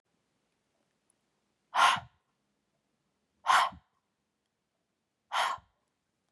{"exhalation_length": "6.3 s", "exhalation_amplitude": 9138, "exhalation_signal_mean_std_ratio": 0.25, "survey_phase": "beta (2021-08-13 to 2022-03-07)", "age": "18-44", "gender": "Female", "wearing_mask": "No", "symptom_change_to_sense_of_smell_or_taste": true, "symptom_onset": "11 days", "smoker_status": "Never smoked", "respiratory_condition_asthma": false, "respiratory_condition_other": false, "recruitment_source": "REACT", "submission_delay": "1 day", "covid_test_result": "Negative", "covid_test_method": "RT-qPCR", "covid_ct_value": 39.0, "covid_ct_gene": "N gene", "influenza_a_test_result": "Negative", "influenza_b_test_result": "Negative"}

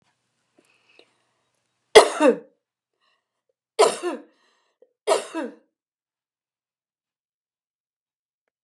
{"three_cough_length": "8.6 s", "three_cough_amplitude": 32768, "three_cough_signal_mean_std_ratio": 0.2, "survey_phase": "beta (2021-08-13 to 2022-03-07)", "age": "45-64", "gender": "Female", "wearing_mask": "No", "symptom_cough_any": true, "symptom_fatigue": true, "smoker_status": "Never smoked", "respiratory_condition_asthma": false, "respiratory_condition_other": false, "recruitment_source": "REACT", "submission_delay": "2 days", "covid_test_result": "Negative", "covid_test_method": "RT-qPCR", "influenza_a_test_result": "Negative", "influenza_b_test_result": "Negative"}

